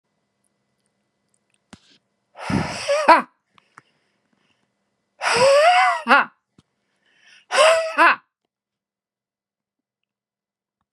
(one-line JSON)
{"exhalation_length": "10.9 s", "exhalation_amplitude": 32767, "exhalation_signal_mean_std_ratio": 0.35, "survey_phase": "beta (2021-08-13 to 2022-03-07)", "age": "65+", "gender": "Male", "wearing_mask": "Yes", "symptom_none": true, "smoker_status": "Ex-smoker", "respiratory_condition_asthma": false, "respiratory_condition_other": false, "recruitment_source": "Test and Trace", "submission_delay": "2 days", "covid_test_result": "Negative", "covid_test_method": "RT-qPCR"}